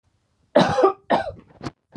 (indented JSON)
{
  "cough_length": "2.0 s",
  "cough_amplitude": 25934,
  "cough_signal_mean_std_ratio": 0.43,
  "survey_phase": "alpha (2021-03-01 to 2021-08-12)",
  "age": "45-64",
  "gender": "Female",
  "wearing_mask": "No",
  "symptom_none": true,
  "symptom_onset": "6 days",
  "smoker_status": "Never smoked",
  "respiratory_condition_asthma": false,
  "respiratory_condition_other": false,
  "recruitment_source": "REACT",
  "submission_delay": "1 day",
  "covid_test_result": "Negative",
  "covid_test_method": "RT-qPCR"
}